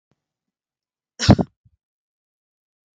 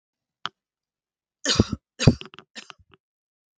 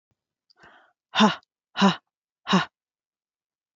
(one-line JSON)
{"cough_length": "3.0 s", "cough_amplitude": 32768, "cough_signal_mean_std_ratio": 0.16, "three_cough_length": "3.6 s", "three_cough_amplitude": 32766, "three_cough_signal_mean_std_ratio": 0.21, "exhalation_length": "3.8 s", "exhalation_amplitude": 18638, "exhalation_signal_mean_std_ratio": 0.29, "survey_phase": "beta (2021-08-13 to 2022-03-07)", "age": "45-64", "gender": "Female", "wearing_mask": "No", "symptom_runny_or_blocked_nose": true, "symptom_sore_throat": true, "symptom_onset": "8 days", "smoker_status": "Never smoked", "respiratory_condition_asthma": false, "respiratory_condition_other": false, "recruitment_source": "REACT", "submission_delay": "2 days", "covid_test_result": "Negative", "covid_test_method": "RT-qPCR", "influenza_a_test_result": "Unknown/Void", "influenza_b_test_result": "Unknown/Void"}